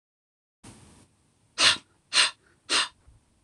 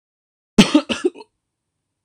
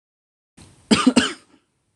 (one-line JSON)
{"exhalation_length": "3.4 s", "exhalation_amplitude": 19884, "exhalation_signal_mean_std_ratio": 0.31, "cough_length": "2.0 s", "cough_amplitude": 26028, "cough_signal_mean_std_ratio": 0.27, "three_cough_length": "2.0 s", "three_cough_amplitude": 26027, "three_cough_signal_mean_std_ratio": 0.31, "survey_phase": "beta (2021-08-13 to 2022-03-07)", "age": "18-44", "gender": "Male", "wearing_mask": "No", "symptom_none": true, "smoker_status": "Never smoked", "respiratory_condition_asthma": true, "respiratory_condition_other": false, "recruitment_source": "REACT", "submission_delay": "2 days", "covid_test_result": "Negative", "covid_test_method": "RT-qPCR", "influenza_a_test_result": "Unknown/Void", "influenza_b_test_result": "Unknown/Void"}